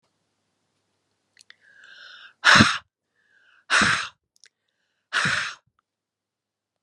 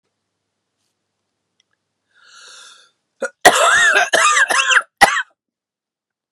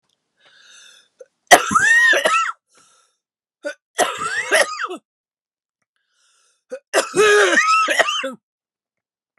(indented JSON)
{
  "exhalation_length": "6.8 s",
  "exhalation_amplitude": 30778,
  "exhalation_signal_mean_std_ratio": 0.28,
  "cough_length": "6.3 s",
  "cough_amplitude": 32768,
  "cough_signal_mean_std_ratio": 0.4,
  "three_cough_length": "9.4 s",
  "three_cough_amplitude": 32768,
  "three_cough_signal_mean_std_ratio": 0.45,
  "survey_phase": "beta (2021-08-13 to 2022-03-07)",
  "age": "45-64",
  "gender": "Female",
  "wearing_mask": "No",
  "symptom_headache": true,
  "symptom_onset": "3 days",
  "smoker_status": "Never smoked",
  "respiratory_condition_asthma": true,
  "respiratory_condition_other": false,
  "recruitment_source": "Test and Trace",
  "submission_delay": "2 days",
  "covid_test_result": "Positive",
  "covid_test_method": "RT-qPCR",
  "covid_ct_value": 18.6,
  "covid_ct_gene": "ORF1ab gene",
  "covid_ct_mean": 19.4,
  "covid_viral_load": "430000 copies/ml",
  "covid_viral_load_category": "Low viral load (10K-1M copies/ml)"
}